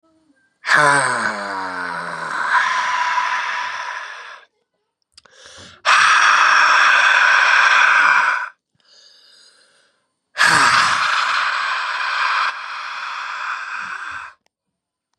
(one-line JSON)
{"exhalation_length": "15.2 s", "exhalation_amplitude": 31418, "exhalation_signal_mean_std_ratio": 0.66, "survey_phase": "beta (2021-08-13 to 2022-03-07)", "age": "18-44", "gender": "Male", "wearing_mask": "No", "symptom_cough_any": true, "symptom_fatigue": true, "symptom_headache": true, "symptom_other": true, "symptom_onset": "2 days", "smoker_status": "Never smoked", "respiratory_condition_asthma": false, "respiratory_condition_other": false, "recruitment_source": "Test and Trace", "submission_delay": "1 day", "covid_test_result": "Positive", "covid_test_method": "RT-qPCR", "covid_ct_value": 23.0, "covid_ct_gene": "ORF1ab gene"}